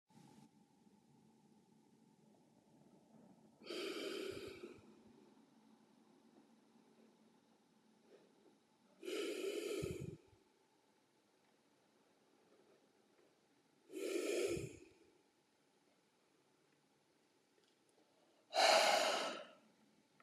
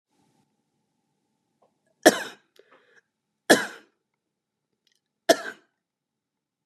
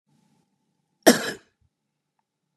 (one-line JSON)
{"exhalation_length": "20.2 s", "exhalation_amplitude": 3576, "exhalation_signal_mean_std_ratio": 0.32, "three_cough_length": "6.7 s", "three_cough_amplitude": 32767, "three_cough_signal_mean_std_ratio": 0.16, "cough_length": "2.6 s", "cough_amplitude": 31728, "cough_signal_mean_std_ratio": 0.18, "survey_phase": "beta (2021-08-13 to 2022-03-07)", "age": "18-44", "gender": "Male", "wearing_mask": "No", "symptom_none": true, "smoker_status": "Never smoked", "respiratory_condition_asthma": false, "respiratory_condition_other": false, "recruitment_source": "REACT", "submission_delay": "4 days", "covid_test_result": "Negative", "covid_test_method": "RT-qPCR", "influenza_a_test_result": "Negative", "influenza_b_test_result": "Negative"}